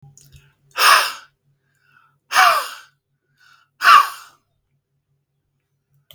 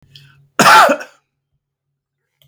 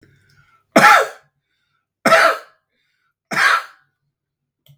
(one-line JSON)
{"exhalation_length": "6.1 s", "exhalation_amplitude": 32768, "exhalation_signal_mean_std_ratio": 0.3, "cough_length": "2.5 s", "cough_amplitude": 32768, "cough_signal_mean_std_ratio": 0.34, "three_cough_length": "4.8 s", "three_cough_amplitude": 32768, "three_cough_signal_mean_std_ratio": 0.34, "survey_phase": "beta (2021-08-13 to 2022-03-07)", "age": "65+", "gender": "Male", "wearing_mask": "No", "symptom_none": true, "smoker_status": "Never smoked", "respiratory_condition_asthma": false, "respiratory_condition_other": false, "recruitment_source": "REACT", "submission_delay": "1 day", "covid_test_result": "Negative", "covid_test_method": "RT-qPCR", "influenza_a_test_result": "Negative", "influenza_b_test_result": "Negative"}